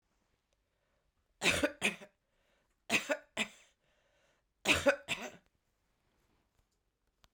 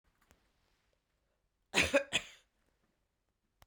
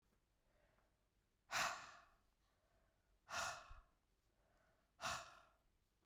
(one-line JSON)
{"three_cough_length": "7.3 s", "three_cough_amplitude": 7487, "three_cough_signal_mean_std_ratio": 0.28, "cough_length": "3.7 s", "cough_amplitude": 7433, "cough_signal_mean_std_ratio": 0.23, "exhalation_length": "6.1 s", "exhalation_amplitude": 1244, "exhalation_signal_mean_std_ratio": 0.34, "survey_phase": "beta (2021-08-13 to 2022-03-07)", "age": "45-64", "gender": "Female", "wearing_mask": "No", "symptom_cough_any": true, "symptom_runny_or_blocked_nose": true, "symptom_diarrhoea": true, "symptom_change_to_sense_of_smell_or_taste": true, "symptom_onset": "4 days", "smoker_status": "Never smoked", "respiratory_condition_asthma": false, "respiratory_condition_other": false, "recruitment_source": "Test and Trace", "submission_delay": "2 days", "covid_test_result": "Positive", "covid_test_method": "RT-qPCR", "covid_ct_value": 23.5, "covid_ct_gene": "ORF1ab gene"}